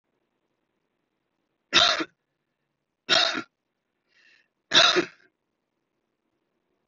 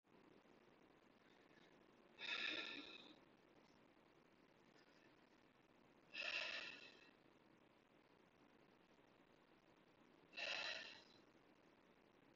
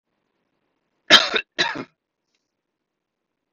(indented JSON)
{
  "three_cough_length": "6.9 s",
  "three_cough_amplitude": 23409,
  "three_cough_signal_mean_std_ratio": 0.27,
  "exhalation_length": "12.4 s",
  "exhalation_amplitude": 654,
  "exhalation_signal_mean_std_ratio": 0.42,
  "cough_length": "3.5 s",
  "cough_amplitude": 32768,
  "cough_signal_mean_std_ratio": 0.22,
  "survey_phase": "beta (2021-08-13 to 2022-03-07)",
  "age": "18-44",
  "gender": "Male",
  "wearing_mask": "No",
  "symptom_fatigue": true,
  "symptom_onset": "11 days",
  "smoker_status": "Never smoked",
  "respiratory_condition_asthma": false,
  "respiratory_condition_other": false,
  "recruitment_source": "REACT",
  "submission_delay": "2 days",
  "covid_test_result": "Negative",
  "covid_test_method": "RT-qPCR",
  "covid_ct_value": 38.0,
  "covid_ct_gene": "N gene",
  "influenza_a_test_result": "Negative",
  "influenza_b_test_result": "Negative"
}